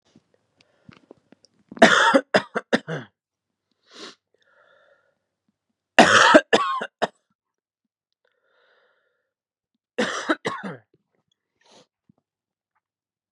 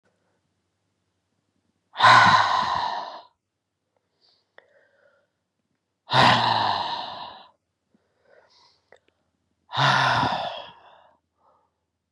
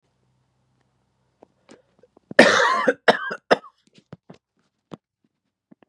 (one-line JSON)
{"three_cough_length": "13.3 s", "three_cough_amplitude": 32768, "three_cough_signal_mean_std_ratio": 0.26, "exhalation_length": "12.1 s", "exhalation_amplitude": 26540, "exhalation_signal_mean_std_ratio": 0.36, "cough_length": "5.9 s", "cough_amplitude": 32768, "cough_signal_mean_std_ratio": 0.26, "survey_phase": "beta (2021-08-13 to 2022-03-07)", "age": "18-44", "gender": "Male", "wearing_mask": "No", "symptom_shortness_of_breath": true, "symptom_change_to_sense_of_smell_or_taste": true, "symptom_loss_of_taste": true, "symptom_onset": "2 days", "smoker_status": "Never smoked", "respiratory_condition_asthma": false, "respiratory_condition_other": false, "recruitment_source": "Test and Trace", "submission_delay": "1 day", "covid_test_result": "Positive", "covid_test_method": "RT-qPCR", "covid_ct_value": 21.4, "covid_ct_gene": "ORF1ab gene"}